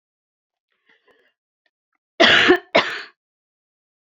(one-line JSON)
{"cough_length": "4.0 s", "cough_amplitude": 28707, "cough_signal_mean_std_ratio": 0.29, "survey_phase": "beta (2021-08-13 to 2022-03-07)", "age": "65+", "gender": "Female", "wearing_mask": "No", "symptom_none": true, "smoker_status": "Never smoked", "respiratory_condition_asthma": false, "respiratory_condition_other": false, "recruitment_source": "REACT", "submission_delay": "2 days", "covid_test_result": "Negative", "covid_test_method": "RT-qPCR"}